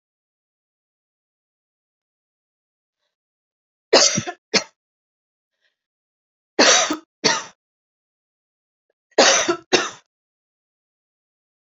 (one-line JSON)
{"three_cough_length": "11.7 s", "three_cough_amplitude": 31318, "three_cough_signal_mean_std_ratio": 0.26, "survey_phase": "beta (2021-08-13 to 2022-03-07)", "age": "18-44", "gender": "Female", "wearing_mask": "No", "symptom_runny_or_blocked_nose": true, "symptom_onset": "12 days", "smoker_status": "Never smoked", "respiratory_condition_asthma": false, "respiratory_condition_other": false, "recruitment_source": "REACT", "submission_delay": "1 day", "covid_test_result": "Negative", "covid_test_method": "RT-qPCR", "influenza_a_test_result": "Unknown/Void", "influenza_b_test_result": "Unknown/Void"}